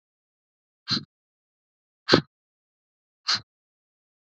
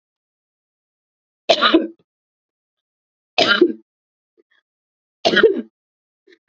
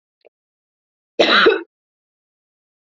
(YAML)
exhalation_length: 4.3 s
exhalation_amplitude: 27288
exhalation_signal_mean_std_ratio: 0.19
three_cough_length: 6.5 s
three_cough_amplitude: 31055
three_cough_signal_mean_std_ratio: 0.29
cough_length: 2.9 s
cough_amplitude: 27672
cough_signal_mean_std_ratio: 0.3
survey_phase: beta (2021-08-13 to 2022-03-07)
age: 18-44
gender: Female
wearing_mask: 'No'
symptom_runny_or_blocked_nose: true
symptom_sore_throat: true
symptom_diarrhoea: true
symptom_fatigue: true
symptom_headache: true
symptom_other: true
symptom_onset: 4 days
smoker_status: Never smoked
respiratory_condition_asthma: false
respiratory_condition_other: false
recruitment_source: Test and Trace
submission_delay: 2 days
covid_test_result: Positive
covid_test_method: ePCR